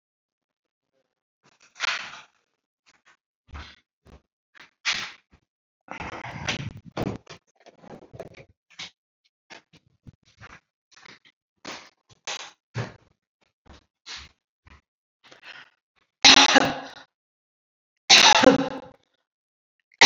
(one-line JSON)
{"three_cough_length": "20.1 s", "three_cough_amplitude": 29672, "three_cough_signal_mean_std_ratio": 0.23, "survey_phase": "beta (2021-08-13 to 2022-03-07)", "age": "65+", "gender": "Female", "wearing_mask": "No", "symptom_none": true, "smoker_status": "Never smoked", "respiratory_condition_asthma": false, "respiratory_condition_other": false, "recruitment_source": "Test and Trace", "submission_delay": "0 days", "covid_test_result": "Negative", "covid_test_method": "LFT"}